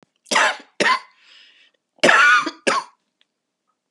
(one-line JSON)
{"three_cough_length": "3.9 s", "three_cough_amplitude": 31150, "three_cough_signal_mean_std_ratio": 0.42, "survey_phase": "beta (2021-08-13 to 2022-03-07)", "age": "45-64", "gender": "Female", "wearing_mask": "No", "symptom_cough_any": true, "symptom_new_continuous_cough": true, "symptom_runny_or_blocked_nose": true, "symptom_abdominal_pain": true, "symptom_fatigue": true, "symptom_fever_high_temperature": true, "symptom_headache": true, "symptom_change_to_sense_of_smell_or_taste": true, "symptom_loss_of_taste": true, "symptom_other": true, "symptom_onset": "6 days", "smoker_status": "Never smoked", "respiratory_condition_asthma": false, "respiratory_condition_other": false, "recruitment_source": "Test and Trace", "submission_delay": "4 days", "covid_test_result": "Positive", "covid_test_method": "RT-qPCR", "covid_ct_value": 20.0, "covid_ct_gene": "ORF1ab gene"}